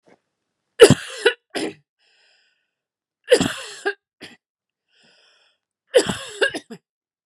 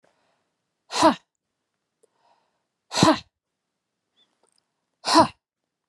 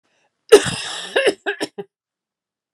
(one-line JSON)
{"three_cough_length": "7.3 s", "three_cough_amplitude": 32768, "three_cough_signal_mean_std_ratio": 0.25, "exhalation_length": "5.9 s", "exhalation_amplitude": 24134, "exhalation_signal_mean_std_ratio": 0.24, "cough_length": "2.7 s", "cough_amplitude": 32768, "cough_signal_mean_std_ratio": 0.32, "survey_phase": "beta (2021-08-13 to 2022-03-07)", "age": "45-64", "gender": "Female", "wearing_mask": "No", "symptom_none": true, "smoker_status": "Never smoked", "respiratory_condition_asthma": false, "respiratory_condition_other": false, "recruitment_source": "REACT", "submission_delay": "2 days", "covid_test_result": "Negative", "covid_test_method": "RT-qPCR"}